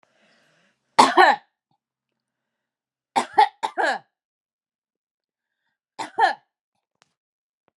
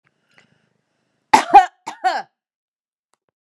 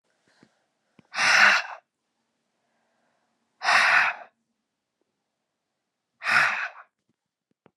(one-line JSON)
{"three_cough_length": "7.8 s", "three_cough_amplitude": 32575, "three_cough_signal_mean_std_ratio": 0.25, "cough_length": "3.4 s", "cough_amplitude": 32768, "cough_signal_mean_std_ratio": 0.23, "exhalation_length": "7.8 s", "exhalation_amplitude": 21185, "exhalation_signal_mean_std_ratio": 0.34, "survey_phase": "beta (2021-08-13 to 2022-03-07)", "age": "45-64", "gender": "Female", "wearing_mask": "No", "symptom_none": true, "smoker_status": "Never smoked", "respiratory_condition_asthma": false, "respiratory_condition_other": false, "recruitment_source": "REACT", "submission_delay": "1 day", "covid_test_result": "Negative", "covid_test_method": "RT-qPCR"}